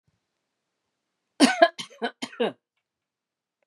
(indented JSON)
{
  "three_cough_length": "3.7 s",
  "three_cough_amplitude": 27894,
  "three_cough_signal_mean_std_ratio": 0.24,
  "survey_phase": "beta (2021-08-13 to 2022-03-07)",
  "age": "45-64",
  "gender": "Female",
  "wearing_mask": "No",
  "symptom_none": true,
  "smoker_status": "Never smoked",
  "respiratory_condition_asthma": true,
  "respiratory_condition_other": false,
  "recruitment_source": "REACT",
  "submission_delay": "2 days",
  "covid_test_result": "Negative",
  "covid_test_method": "RT-qPCR",
  "influenza_a_test_result": "Negative",
  "influenza_b_test_result": "Negative"
}